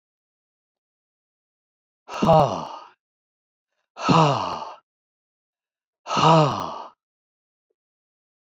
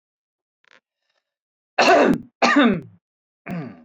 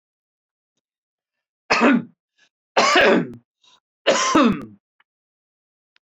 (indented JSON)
{
  "exhalation_length": "8.4 s",
  "exhalation_amplitude": 23893,
  "exhalation_signal_mean_std_ratio": 0.33,
  "cough_length": "3.8 s",
  "cough_amplitude": 27559,
  "cough_signal_mean_std_ratio": 0.4,
  "three_cough_length": "6.1 s",
  "three_cough_amplitude": 26008,
  "three_cough_signal_mean_std_ratio": 0.38,
  "survey_phase": "beta (2021-08-13 to 2022-03-07)",
  "age": "45-64",
  "gender": "Male",
  "wearing_mask": "No",
  "symptom_none": true,
  "smoker_status": "Ex-smoker",
  "respiratory_condition_asthma": false,
  "respiratory_condition_other": false,
  "recruitment_source": "Test and Trace",
  "submission_delay": "1 day",
  "covid_test_result": "Negative",
  "covid_test_method": "RT-qPCR"
}